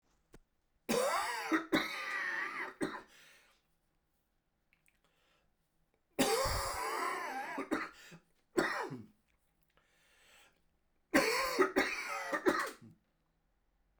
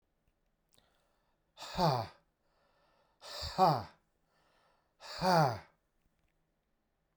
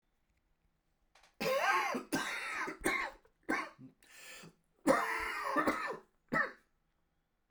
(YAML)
three_cough_length: 14.0 s
three_cough_amplitude: 8556
three_cough_signal_mean_std_ratio: 0.49
exhalation_length: 7.2 s
exhalation_amplitude: 5918
exhalation_signal_mean_std_ratio: 0.31
cough_length: 7.5 s
cough_amplitude: 6538
cough_signal_mean_std_ratio: 0.52
survey_phase: beta (2021-08-13 to 2022-03-07)
age: 45-64
gender: Male
wearing_mask: 'No'
symptom_cough_any: true
symptom_new_continuous_cough: true
symptom_runny_or_blocked_nose: true
symptom_shortness_of_breath: true
symptom_fatigue: true
symptom_headache: true
symptom_change_to_sense_of_smell_or_taste: true
symptom_loss_of_taste: true
symptom_onset: 5 days
smoker_status: Never smoked
respiratory_condition_asthma: false
respiratory_condition_other: false
recruitment_source: Test and Trace
submission_delay: 2 days
covid_test_result: Positive
covid_test_method: RT-qPCR
covid_ct_value: 15.9
covid_ct_gene: ORF1ab gene
covid_ct_mean: 16.4
covid_viral_load: 4100000 copies/ml
covid_viral_load_category: High viral load (>1M copies/ml)